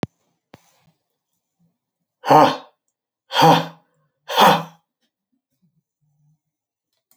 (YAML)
exhalation_length: 7.2 s
exhalation_amplitude: 29116
exhalation_signal_mean_std_ratio: 0.27
survey_phase: alpha (2021-03-01 to 2021-08-12)
age: 65+
gender: Male
wearing_mask: 'No'
symptom_none: true
smoker_status: Never smoked
respiratory_condition_asthma: false
respiratory_condition_other: false
recruitment_source: REACT
submission_delay: 2 days
covid_test_result: Negative
covid_test_method: RT-qPCR